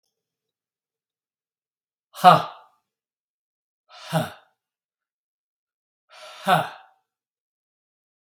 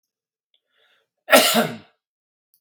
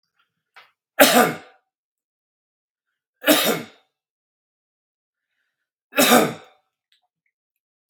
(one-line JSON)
{"exhalation_length": "8.4 s", "exhalation_amplitude": 32768, "exhalation_signal_mean_std_ratio": 0.18, "cough_length": "2.6 s", "cough_amplitude": 32767, "cough_signal_mean_std_ratio": 0.29, "three_cough_length": "7.9 s", "three_cough_amplitude": 32767, "three_cough_signal_mean_std_ratio": 0.27, "survey_phase": "beta (2021-08-13 to 2022-03-07)", "age": "65+", "gender": "Male", "wearing_mask": "No", "symptom_cough_any": true, "smoker_status": "Ex-smoker", "respiratory_condition_asthma": false, "respiratory_condition_other": false, "recruitment_source": "Test and Trace", "submission_delay": "0 days", "covid_test_result": "Positive", "covid_test_method": "LFT"}